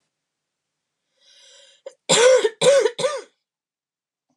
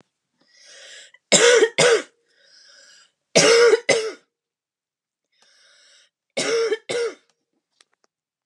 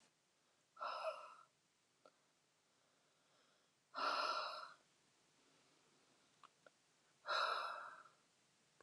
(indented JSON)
{
  "cough_length": "4.4 s",
  "cough_amplitude": 24893,
  "cough_signal_mean_std_ratio": 0.37,
  "three_cough_length": "8.5 s",
  "three_cough_amplitude": 32166,
  "three_cough_signal_mean_std_ratio": 0.38,
  "exhalation_length": "8.8 s",
  "exhalation_amplitude": 1305,
  "exhalation_signal_mean_std_ratio": 0.39,
  "survey_phase": "beta (2021-08-13 to 2022-03-07)",
  "age": "18-44",
  "gender": "Female",
  "wearing_mask": "No",
  "symptom_runny_or_blocked_nose": true,
  "symptom_fatigue": true,
  "symptom_onset": "4 days",
  "smoker_status": "Current smoker (1 to 10 cigarettes per day)",
  "respiratory_condition_asthma": true,
  "respiratory_condition_other": false,
  "recruitment_source": "REACT",
  "submission_delay": "0 days",
  "covid_test_result": "Negative",
  "covid_test_method": "RT-qPCR"
}